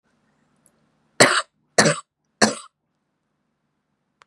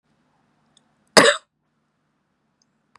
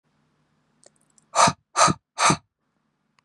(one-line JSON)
{"three_cough_length": "4.3 s", "three_cough_amplitude": 32695, "three_cough_signal_mean_std_ratio": 0.25, "cough_length": "3.0 s", "cough_amplitude": 32768, "cough_signal_mean_std_ratio": 0.19, "exhalation_length": "3.2 s", "exhalation_amplitude": 24015, "exhalation_signal_mean_std_ratio": 0.31, "survey_phase": "beta (2021-08-13 to 2022-03-07)", "age": "18-44", "gender": "Female", "wearing_mask": "No", "symptom_none": true, "smoker_status": "Never smoked", "respiratory_condition_asthma": false, "respiratory_condition_other": false, "recruitment_source": "REACT", "submission_delay": "1 day", "covid_test_result": "Negative", "covid_test_method": "RT-qPCR", "influenza_a_test_result": "Negative", "influenza_b_test_result": "Negative"}